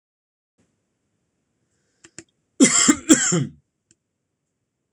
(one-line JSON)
{"cough_length": "4.9 s", "cough_amplitude": 26027, "cough_signal_mean_std_ratio": 0.28, "survey_phase": "alpha (2021-03-01 to 2021-08-12)", "age": "18-44", "gender": "Male", "wearing_mask": "No", "symptom_none": true, "smoker_status": "Never smoked", "respiratory_condition_asthma": true, "respiratory_condition_other": false, "recruitment_source": "REACT", "submission_delay": "2 days", "covid_test_result": "Negative", "covid_test_method": "RT-qPCR"}